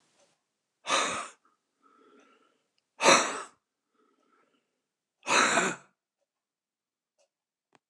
{"exhalation_length": "7.9 s", "exhalation_amplitude": 15468, "exhalation_signal_mean_std_ratio": 0.28, "survey_phase": "alpha (2021-03-01 to 2021-08-12)", "age": "65+", "gender": "Male", "wearing_mask": "No", "symptom_none": true, "smoker_status": "Current smoker (1 to 10 cigarettes per day)", "respiratory_condition_asthma": false, "respiratory_condition_other": false, "recruitment_source": "REACT", "submission_delay": "8 days", "covid_test_result": "Negative", "covid_test_method": "RT-qPCR"}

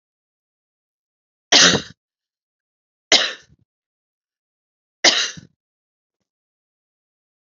{"three_cough_length": "7.5 s", "three_cough_amplitude": 32768, "three_cough_signal_mean_std_ratio": 0.22, "survey_phase": "beta (2021-08-13 to 2022-03-07)", "age": "45-64", "gender": "Female", "wearing_mask": "No", "symptom_cough_any": true, "symptom_new_continuous_cough": true, "symptom_runny_or_blocked_nose": true, "symptom_sore_throat": true, "symptom_abdominal_pain": true, "symptom_fatigue": true, "symptom_headache": true, "symptom_change_to_sense_of_smell_or_taste": true, "symptom_onset": "3 days", "smoker_status": "Ex-smoker", "respiratory_condition_asthma": true, "respiratory_condition_other": false, "recruitment_source": "Test and Trace", "submission_delay": "2 days", "covid_test_result": "Positive", "covid_test_method": "RT-qPCR", "covid_ct_value": 34.8, "covid_ct_gene": "ORF1ab gene"}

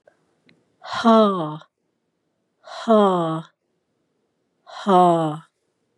{"exhalation_length": "6.0 s", "exhalation_amplitude": 23476, "exhalation_signal_mean_std_ratio": 0.4, "survey_phase": "beta (2021-08-13 to 2022-03-07)", "age": "45-64", "gender": "Female", "wearing_mask": "No", "symptom_cough_any": true, "symptom_runny_or_blocked_nose": true, "symptom_fatigue": true, "symptom_change_to_sense_of_smell_or_taste": true, "symptom_loss_of_taste": true, "symptom_onset": "6 days", "smoker_status": "Ex-smoker", "respiratory_condition_asthma": false, "respiratory_condition_other": false, "recruitment_source": "REACT", "submission_delay": "0 days", "covid_test_result": "Positive", "covid_test_method": "RT-qPCR", "covid_ct_value": 18.7, "covid_ct_gene": "E gene", "influenza_a_test_result": "Negative", "influenza_b_test_result": "Negative"}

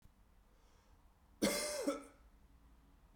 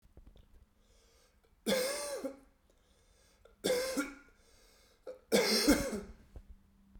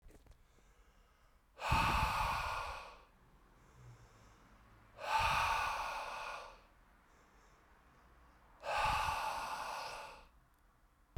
{"cough_length": "3.2 s", "cough_amplitude": 3413, "cough_signal_mean_std_ratio": 0.39, "three_cough_length": "7.0 s", "three_cough_amplitude": 6205, "three_cough_signal_mean_std_ratio": 0.42, "exhalation_length": "11.2 s", "exhalation_amplitude": 3379, "exhalation_signal_mean_std_ratio": 0.53, "survey_phase": "beta (2021-08-13 to 2022-03-07)", "age": "18-44", "gender": "Male", "wearing_mask": "No", "symptom_cough_any": true, "symptom_runny_or_blocked_nose": true, "symptom_sore_throat": true, "symptom_change_to_sense_of_smell_or_taste": true, "symptom_onset": "6 days", "smoker_status": "Never smoked", "respiratory_condition_asthma": false, "respiratory_condition_other": false, "recruitment_source": "Test and Trace", "submission_delay": "2 days", "covid_test_result": "Positive", "covid_test_method": "RT-qPCR", "covid_ct_value": 21.5, "covid_ct_gene": "ORF1ab gene"}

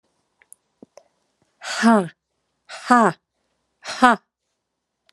{"exhalation_length": "5.1 s", "exhalation_amplitude": 32767, "exhalation_signal_mean_std_ratio": 0.28, "survey_phase": "alpha (2021-03-01 to 2021-08-12)", "age": "45-64", "gender": "Female", "wearing_mask": "Yes", "symptom_shortness_of_breath": true, "symptom_fatigue": true, "symptom_onset": "12 days", "smoker_status": "Ex-smoker", "respiratory_condition_asthma": false, "respiratory_condition_other": false, "recruitment_source": "REACT", "submission_delay": "1 day", "covid_test_result": "Negative", "covid_test_method": "RT-qPCR"}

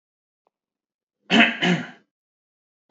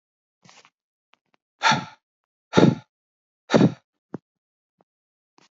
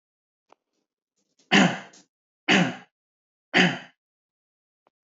{"cough_length": "2.9 s", "cough_amplitude": 25161, "cough_signal_mean_std_ratio": 0.3, "exhalation_length": "5.5 s", "exhalation_amplitude": 26730, "exhalation_signal_mean_std_ratio": 0.24, "three_cough_length": "5.0 s", "three_cough_amplitude": 25885, "three_cough_signal_mean_std_ratio": 0.29, "survey_phase": "beta (2021-08-13 to 2022-03-07)", "age": "18-44", "gender": "Male", "wearing_mask": "No", "symptom_none": true, "smoker_status": "Never smoked", "respiratory_condition_asthma": true, "respiratory_condition_other": false, "recruitment_source": "Test and Trace", "submission_delay": "0 days", "covid_test_result": "Negative", "covid_test_method": "LFT"}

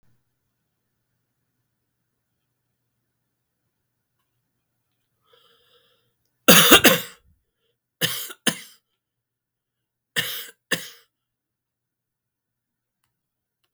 {"three_cough_length": "13.7 s", "three_cough_amplitude": 32768, "three_cough_signal_mean_std_ratio": 0.18, "survey_phase": "beta (2021-08-13 to 2022-03-07)", "age": "65+", "gender": "Male", "wearing_mask": "No", "symptom_cough_any": true, "symptom_runny_or_blocked_nose": true, "symptom_onset": "3 days", "smoker_status": "Never smoked", "respiratory_condition_asthma": false, "respiratory_condition_other": false, "recruitment_source": "Test and Trace", "submission_delay": "2 days", "covid_test_result": "Positive", "covid_test_method": "RT-qPCR", "covid_ct_value": 16.2, "covid_ct_gene": "ORF1ab gene", "covid_ct_mean": 16.3, "covid_viral_load": "4400000 copies/ml", "covid_viral_load_category": "High viral load (>1M copies/ml)"}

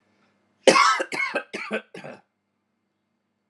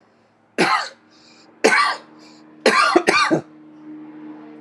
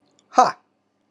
{"cough_length": "3.5 s", "cough_amplitude": 31411, "cough_signal_mean_std_ratio": 0.34, "three_cough_length": "4.6 s", "three_cough_amplitude": 32762, "three_cough_signal_mean_std_ratio": 0.47, "exhalation_length": "1.1 s", "exhalation_amplitude": 31616, "exhalation_signal_mean_std_ratio": 0.26, "survey_phase": "alpha (2021-03-01 to 2021-08-12)", "age": "18-44", "gender": "Male", "wearing_mask": "No", "symptom_none": true, "smoker_status": "Ex-smoker", "respiratory_condition_asthma": false, "respiratory_condition_other": false, "recruitment_source": "REACT", "submission_delay": "1 day", "covid_test_result": "Negative", "covid_test_method": "RT-qPCR"}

